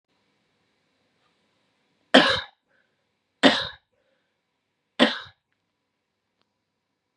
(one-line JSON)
{"three_cough_length": "7.2 s", "three_cough_amplitude": 32768, "three_cough_signal_mean_std_ratio": 0.21, "survey_phase": "beta (2021-08-13 to 2022-03-07)", "age": "18-44", "gender": "Female", "wearing_mask": "No", "symptom_fatigue": true, "symptom_headache": true, "symptom_change_to_sense_of_smell_or_taste": true, "symptom_onset": "2 days", "smoker_status": "Current smoker (1 to 10 cigarettes per day)", "respiratory_condition_asthma": false, "respiratory_condition_other": false, "recruitment_source": "Test and Trace", "submission_delay": "2 days", "covid_test_result": "Positive", "covid_test_method": "RT-qPCR", "covid_ct_value": 33.1, "covid_ct_gene": "N gene"}